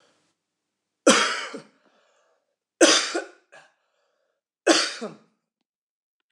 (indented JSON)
{
  "three_cough_length": "6.3 s",
  "three_cough_amplitude": 25892,
  "three_cough_signal_mean_std_ratio": 0.3,
  "survey_phase": "beta (2021-08-13 to 2022-03-07)",
  "age": "45-64",
  "gender": "Male",
  "wearing_mask": "No",
  "symptom_none": true,
  "smoker_status": "Never smoked",
  "respiratory_condition_asthma": false,
  "respiratory_condition_other": false,
  "recruitment_source": "REACT",
  "submission_delay": "1 day",
  "covid_test_result": "Negative",
  "covid_test_method": "RT-qPCR"
}